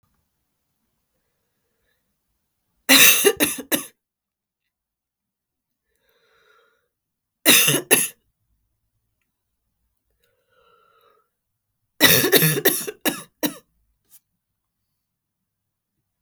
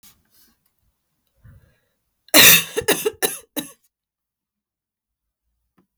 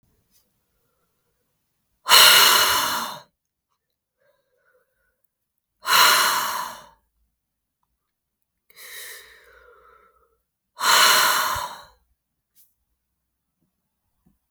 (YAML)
three_cough_length: 16.2 s
three_cough_amplitude: 32768
three_cough_signal_mean_std_ratio: 0.27
cough_length: 6.0 s
cough_amplitude: 32768
cough_signal_mean_std_ratio: 0.24
exhalation_length: 14.5 s
exhalation_amplitude: 32768
exhalation_signal_mean_std_ratio: 0.33
survey_phase: beta (2021-08-13 to 2022-03-07)
age: 45-64
gender: Female
wearing_mask: 'No'
symptom_cough_any: true
symptom_new_continuous_cough: true
symptom_runny_or_blocked_nose: true
symptom_shortness_of_breath: true
symptom_sore_throat: true
symptom_fatigue: true
symptom_fever_high_temperature: true
symptom_headache: true
symptom_change_to_sense_of_smell_or_taste: true
symptom_onset: 5 days
smoker_status: Never smoked
respiratory_condition_asthma: false
respiratory_condition_other: false
recruitment_source: Test and Trace
submission_delay: 3 days
covid_test_result: Positive
covid_test_method: RT-qPCR
covid_ct_value: 31.8
covid_ct_gene: ORF1ab gene
covid_ct_mean: 32.6
covid_viral_load: 20 copies/ml
covid_viral_load_category: Minimal viral load (< 10K copies/ml)